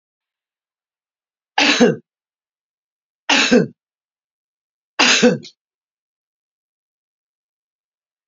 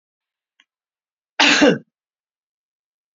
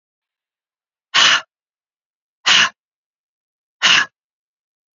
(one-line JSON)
{"three_cough_length": "8.3 s", "three_cough_amplitude": 30383, "three_cough_signal_mean_std_ratio": 0.29, "cough_length": "3.2 s", "cough_amplitude": 32767, "cough_signal_mean_std_ratio": 0.27, "exhalation_length": "4.9 s", "exhalation_amplitude": 32768, "exhalation_signal_mean_std_ratio": 0.3, "survey_phase": "beta (2021-08-13 to 2022-03-07)", "age": "65+", "gender": "Female", "wearing_mask": "No", "symptom_none": true, "smoker_status": "Never smoked", "respiratory_condition_asthma": false, "respiratory_condition_other": false, "recruitment_source": "REACT", "submission_delay": "1 day", "covid_test_result": "Negative", "covid_test_method": "RT-qPCR"}